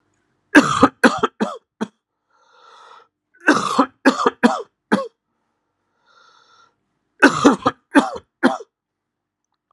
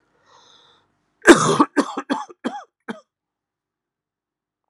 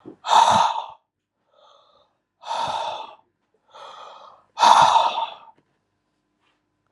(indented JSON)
{
  "three_cough_length": "9.7 s",
  "three_cough_amplitude": 32768,
  "three_cough_signal_mean_std_ratio": 0.33,
  "cough_length": "4.7 s",
  "cough_amplitude": 32768,
  "cough_signal_mean_std_ratio": 0.25,
  "exhalation_length": "6.9 s",
  "exhalation_amplitude": 30729,
  "exhalation_signal_mean_std_ratio": 0.38,
  "survey_phase": "alpha (2021-03-01 to 2021-08-12)",
  "age": "45-64",
  "gender": "Male",
  "wearing_mask": "No",
  "symptom_cough_any": true,
  "symptom_fatigue": true,
  "symptom_fever_high_temperature": true,
  "symptom_onset": "6 days",
  "smoker_status": "Ex-smoker",
  "respiratory_condition_asthma": false,
  "respiratory_condition_other": false,
  "recruitment_source": "Test and Trace",
  "submission_delay": "1 day",
  "covid_test_result": "Positive",
  "covid_test_method": "RT-qPCR",
  "covid_ct_value": 12.3,
  "covid_ct_gene": "S gene",
  "covid_ct_mean": 12.7,
  "covid_viral_load": "69000000 copies/ml",
  "covid_viral_load_category": "High viral load (>1M copies/ml)"
}